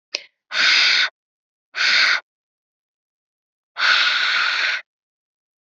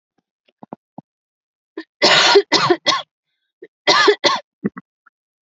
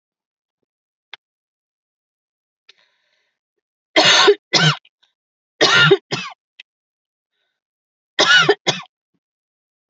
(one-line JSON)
{"exhalation_length": "5.6 s", "exhalation_amplitude": 29994, "exhalation_signal_mean_std_ratio": 0.52, "cough_length": "5.5 s", "cough_amplitude": 32768, "cough_signal_mean_std_ratio": 0.39, "three_cough_length": "9.9 s", "three_cough_amplitude": 32768, "three_cough_signal_mean_std_ratio": 0.31, "survey_phase": "alpha (2021-03-01 to 2021-08-12)", "age": "18-44", "gender": "Female", "wearing_mask": "No", "symptom_none": true, "smoker_status": "Never smoked", "respiratory_condition_asthma": false, "respiratory_condition_other": false, "recruitment_source": "REACT", "submission_delay": "1 day", "covid_test_result": "Negative", "covid_test_method": "RT-qPCR"}